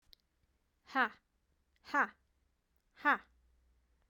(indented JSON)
{
  "exhalation_length": "4.1 s",
  "exhalation_amplitude": 4685,
  "exhalation_signal_mean_std_ratio": 0.24,
  "survey_phase": "beta (2021-08-13 to 2022-03-07)",
  "age": "18-44",
  "gender": "Female",
  "wearing_mask": "No",
  "symptom_change_to_sense_of_smell_or_taste": true,
  "smoker_status": "Never smoked",
  "respiratory_condition_asthma": false,
  "respiratory_condition_other": false,
  "recruitment_source": "REACT",
  "submission_delay": "1 day",
  "covid_test_result": "Negative",
  "covid_test_method": "RT-qPCR",
  "influenza_a_test_result": "Negative",
  "influenza_b_test_result": "Negative"
}